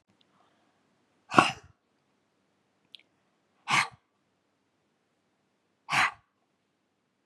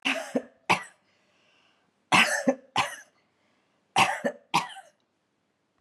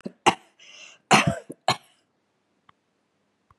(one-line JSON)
{"exhalation_length": "7.3 s", "exhalation_amplitude": 28107, "exhalation_signal_mean_std_ratio": 0.2, "three_cough_length": "5.8 s", "three_cough_amplitude": 15724, "three_cough_signal_mean_std_ratio": 0.36, "cough_length": "3.6 s", "cough_amplitude": 27634, "cough_signal_mean_std_ratio": 0.25, "survey_phase": "beta (2021-08-13 to 2022-03-07)", "age": "45-64", "gender": "Female", "wearing_mask": "No", "symptom_none": true, "smoker_status": "Ex-smoker", "respiratory_condition_asthma": false, "respiratory_condition_other": false, "recruitment_source": "REACT", "submission_delay": "3 days", "covid_test_result": "Negative", "covid_test_method": "RT-qPCR", "influenza_a_test_result": "Negative", "influenza_b_test_result": "Negative"}